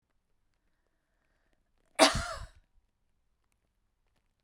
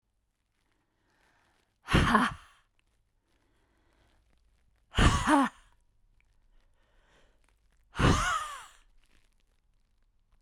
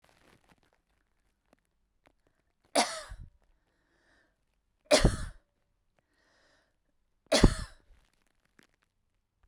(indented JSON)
{
  "cough_length": "4.4 s",
  "cough_amplitude": 17021,
  "cough_signal_mean_std_ratio": 0.18,
  "exhalation_length": "10.4 s",
  "exhalation_amplitude": 12868,
  "exhalation_signal_mean_std_ratio": 0.3,
  "three_cough_length": "9.5 s",
  "three_cough_amplitude": 19850,
  "three_cough_signal_mean_std_ratio": 0.2,
  "survey_phase": "beta (2021-08-13 to 2022-03-07)",
  "age": "65+",
  "gender": "Female",
  "wearing_mask": "No",
  "symptom_none": true,
  "smoker_status": "Ex-smoker",
  "respiratory_condition_asthma": false,
  "respiratory_condition_other": false,
  "recruitment_source": "REACT",
  "submission_delay": "2 days",
  "covid_test_result": "Negative",
  "covid_test_method": "RT-qPCR"
}